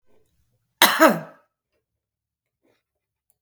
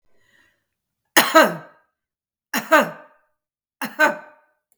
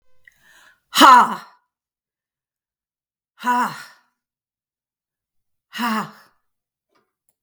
{
  "cough_length": "3.4 s",
  "cough_amplitude": 32768,
  "cough_signal_mean_std_ratio": 0.23,
  "three_cough_length": "4.8 s",
  "three_cough_amplitude": 32768,
  "three_cough_signal_mean_std_ratio": 0.3,
  "exhalation_length": "7.4 s",
  "exhalation_amplitude": 32768,
  "exhalation_signal_mean_std_ratio": 0.24,
  "survey_phase": "beta (2021-08-13 to 2022-03-07)",
  "age": "45-64",
  "gender": "Female",
  "wearing_mask": "No",
  "symptom_runny_or_blocked_nose": true,
  "smoker_status": "Current smoker (1 to 10 cigarettes per day)",
  "respiratory_condition_asthma": true,
  "respiratory_condition_other": false,
  "recruitment_source": "Test and Trace",
  "submission_delay": "2 days",
  "covid_test_result": "Positive",
  "covid_test_method": "RT-qPCR",
  "covid_ct_value": 17.3,
  "covid_ct_gene": "ORF1ab gene",
  "covid_ct_mean": 17.4,
  "covid_viral_load": "2000000 copies/ml",
  "covid_viral_load_category": "High viral load (>1M copies/ml)"
}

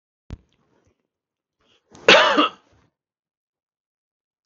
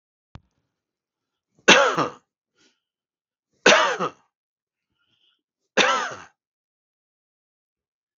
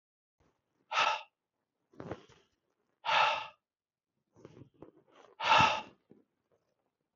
{
  "cough_length": "4.5 s",
  "cough_amplitude": 32767,
  "cough_signal_mean_std_ratio": 0.23,
  "three_cough_length": "8.2 s",
  "three_cough_amplitude": 32768,
  "three_cough_signal_mean_std_ratio": 0.26,
  "exhalation_length": "7.2 s",
  "exhalation_amplitude": 8429,
  "exhalation_signal_mean_std_ratio": 0.31,
  "survey_phase": "beta (2021-08-13 to 2022-03-07)",
  "age": "65+",
  "gender": "Male",
  "wearing_mask": "No",
  "symptom_none": true,
  "smoker_status": "Ex-smoker",
  "respiratory_condition_asthma": false,
  "respiratory_condition_other": false,
  "recruitment_source": "REACT",
  "submission_delay": "1 day",
  "covid_test_result": "Negative",
  "covid_test_method": "RT-qPCR",
  "influenza_a_test_result": "Negative",
  "influenza_b_test_result": "Negative"
}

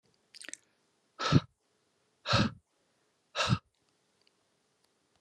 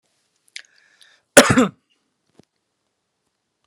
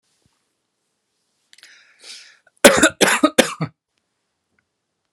{
  "exhalation_length": "5.2 s",
  "exhalation_amplitude": 10734,
  "exhalation_signal_mean_std_ratio": 0.27,
  "cough_length": "3.7 s",
  "cough_amplitude": 32768,
  "cough_signal_mean_std_ratio": 0.2,
  "three_cough_length": "5.1 s",
  "three_cough_amplitude": 32768,
  "three_cough_signal_mean_std_ratio": 0.25,
  "survey_phase": "beta (2021-08-13 to 2022-03-07)",
  "age": "18-44",
  "gender": "Male",
  "wearing_mask": "No",
  "symptom_none": true,
  "smoker_status": "Never smoked",
  "respiratory_condition_asthma": false,
  "respiratory_condition_other": false,
  "recruitment_source": "Test and Trace",
  "submission_delay": "0 days",
  "covid_test_result": "Negative",
  "covid_test_method": "LFT"
}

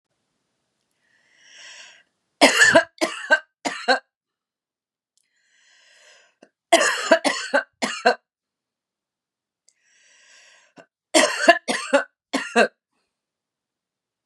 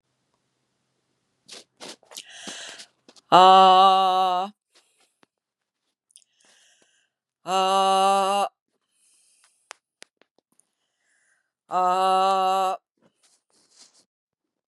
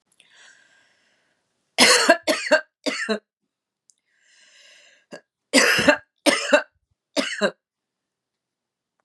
{
  "three_cough_length": "14.3 s",
  "three_cough_amplitude": 32767,
  "three_cough_signal_mean_std_ratio": 0.31,
  "exhalation_length": "14.7 s",
  "exhalation_amplitude": 29955,
  "exhalation_signal_mean_std_ratio": 0.35,
  "cough_length": "9.0 s",
  "cough_amplitude": 32262,
  "cough_signal_mean_std_ratio": 0.34,
  "survey_phase": "beta (2021-08-13 to 2022-03-07)",
  "age": "45-64",
  "gender": "Female",
  "wearing_mask": "No",
  "symptom_none": true,
  "smoker_status": "Never smoked",
  "respiratory_condition_asthma": false,
  "respiratory_condition_other": false,
  "recruitment_source": "Test and Trace",
  "submission_delay": "3 days",
  "covid_test_result": "Positive",
  "covid_test_method": "RT-qPCR",
  "covid_ct_value": 29.1,
  "covid_ct_gene": "N gene",
  "covid_ct_mean": 29.4,
  "covid_viral_load": "220 copies/ml",
  "covid_viral_load_category": "Minimal viral load (< 10K copies/ml)"
}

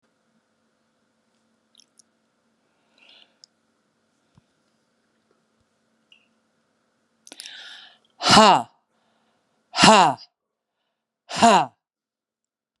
{
  "exhalation_length": "12.8 s",
  "exhalation_amplitude": 32767,
  "exhalation_signal_mean_std_ratio": 0.22,
  "survey_phase": "beta (2021-08-13 to 2022-03-07)",
  "age": "65+",
  "gender": "Female",
  "wearing_mask": "No",
  "symptom_runny_or_blocked_nose": true,
  "symptom_headache": true,
  "smoker_status": "Never smoked",
  "respiratory_condition_asthma": false,
  "respiratory_condition_other": false,
  "recruitment_source": "REACT",
  "submission_delay": "2 days",
  "covid_test_result": "Negative",
  "covid_test_method": "RT-qPCR"
}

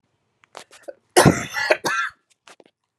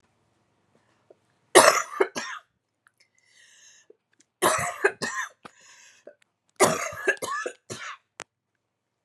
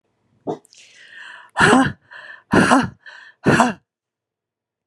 {
  "cough_length": "3.0 s",
  "cough_amplitude": 32430,
  "cough_signal_mean_std_ratio": 0.33,
  "three_cough_length": "9.0 s",
  "three_cough_amplitude": 32767,
  "three_cough_signal_mean_std_ratio": 0.3,
  "exhalation_length": "4.9 s",
  "exhalation_amplitude": 32768,
  "exhalation_signal_mean_std_ratio": 0.38,
  "survey_phase": "beta (2021-08-13 to 2022-03-07)",
  "age": "45-64",
  "gender": "Female",
  "wearing_mask": "No",
  "symptom_cough_any": true,
  "symptom_runny_or_blocked_nose": true,
  "symptom_shortness_of_breath": true,
  "symptom_change_to_sense_of_smell_or_taste": true,
  "symptom_loss_of_taste": true,
  "symptom_onset": "4 days",
  "smoker_status": "Never smoked",
  "respiratory_condition_asthma": true,
  "respiratory_condition_other": false,
  "recruitment_source": "Test and Trace",
  "submission_delay": "2 days",
  "covid_test_result": "Positive",
  "covid_test_method": "LAMP"
}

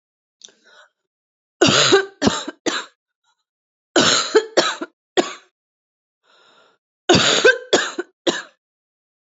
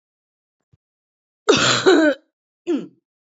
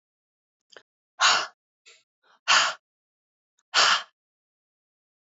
{
  "three_cough_length": "9.3 s",
  "three_cough_amplitude": 28058,
  "three_cough_signal_mean_std_ratio": 0.39,
  "cough_length": "3.2 s",
  "cough_amplitude": 25982,
  "cough_signal_mean_std_ratio": 0.4,
  "exhalation_length": "5.2 s",
  "exhalation_amplitude": 16440,
  "exhalation_signal_mean_std_ratio": 0.3,
  "survey_phase": "beta (2021-08-13 to 2022-03-07)",
  "age": "45-64",
  "gender": "Female",
  "wearing_mask": "No",
  "symptom_cough_any": true,
  "symptom_new_continuous_cough": true,
  "symptom_sore_throat": true,
  "symptom_onset": "2 days",
  "smoker_status": "Never smoked",
  "respiratory_condition_asthma": false,
  "respiratory_condition_other": false,
  "recruitment_source": "Test and Trace",
  "submission_delay": "2 days",
  "covid_test_result": "Positive",
  "covid_test_method": "RT-qPCR",
  "covid_ct_value": 20.5,
  "covid_ct_gene": "ORF1ab gene",
  "covid_ct_mean": 20.7,
  "covid_viral_load": "160000 copies/ml",
  "covid_viral_load_category": "Low viral load (10K-1M copies/ml)"
}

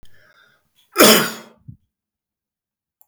{
  "cough_length": "3.1 s",
  "cough_amplitude": 32768,
  "cough_signal_mean_std_ratio": 0.26,
  "survey_phase": "beta (2021-08-13 to 2022-03-07)",
  "age": "65+",
  "gender": "Male",
  "wearing_mask": "No",
  "symptom_none": true,
  "smoker_status": "Never smoked",
  "respiratory_condition_asthma": false,
  "respiratory_condition_other": false,
  "recruitment_source": "REACT",
  "submission_delay": "2 days",
  "covid_test_result": "Negative",
  "covid_test_method": "RT-qPCR",
  "influenza_a_test_result": "Negative",
  "influenza_b_test_result": "Negative"
}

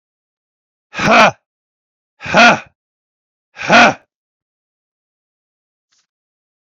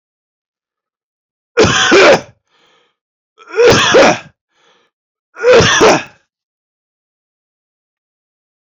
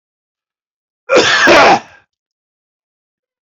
{
  "exhalation_length": "6.7 s",
  "exhalation_amplitude": 30508,
  "exhalation_signal_mean_std_ratio": 0.3,
  "three_cough_length": "8.7 s",
  "three_cough_amplitude": 32768,
  "three_cough_signal_mean_std_ratio": 0.41,
  "cough_length": "3.4 s",
  "cough_amplitude": 32021,
  "cough_signal_mean_std_ratio": 0.4,
  "survey_phase": "beta (2021-08-13 to 2022-03-07)",
  "age": "45-64",
  "gender": "Male",
  "wearing_mask": "No",
  "symptom_none": true,
  "smoker_status": "Never smoked",
  "respiratory_condition_asthma": false,
  "respiratory_condition_other": false,
  "recruitment_source": "REACT",
  "submission_delay": "2 days",
  "covid_test_result": "Negative",
  "covid_test_method": "RT-qPCR"
}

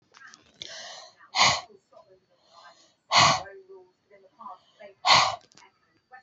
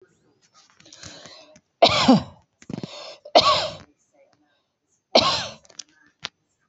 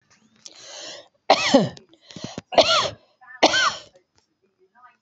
{
  "exhalation_length": "6.2 s",
  "exhalation_amplitude": 18231,
  "exhalation_signal_mean_std_ratio": 0.32,
  "three_cough_length": "6.7 s",
  "three_cough_amplitude": 27397,
  "three_cough_signal_mean_std_ratio": 0.31,
  "cough_length": "5.0 s",
  "cough_amplitude": 27807,
  "cough_signal_mean_std_ratio": 0.37,
  "survey_phase": "beta (2021-08-13 to 2022-03-07)",
  "age": "65+",
  "gender": "Female",
  "wearing_mask": "No",
  "symptom_runny_or_blocked_nose": true,
  "symptom_headache": true,
  "smoker_status": "Ex-smoker",
  "respiratory_condition_asthma": false,
  "respiratory_condition_other": false,
  "recruitment_source": "Test and Trace",
  "submission_delay": "1 day",
  "covid_test_result": "Positive",
  "covid_test_method": "RT-qPCR",
  "covid_ct_value": 22.4,
  "covid_ct_gene": "ORF1ab gene",
  "covid_ct_mean": 23.0,
  "covid_viral_load": "29000 copies/ml",
  "covid_viral_load_category": "Low viral load (10K-1M copies/ml)"
}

